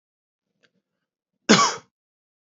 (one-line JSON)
{"cough_length": "2.6 s", "cough_amplitude": 29607, "cough_signal_mean_std_ratio": 0.23, "survey_phase": "beta (2021-08-13 to 2022-03-07)", "age": "18-44", "gender": "Male", "wearing_mask": "No", "symptom_cough_any": true, "symptom_sore_throat": true, "symptom_onset": "4 days", "smoker_status": "Never smoked", "respiratory_condition_asthma": false, "respiratory_condition_other": false, "recruitment_source": "Test and Trace", "submission_delay": "1 day", "covid_test_result": "Positive", "covid_test_method": "RT-qPCR", "covid_ct_value": 29.9, "covid_ct_gene": "N gene", "covid_ct_mean": 30.0, "covid_viral_load": "150 copies/ml", "covid_viral_load_category": "Minimal viral load (< 10K copies/ml)"}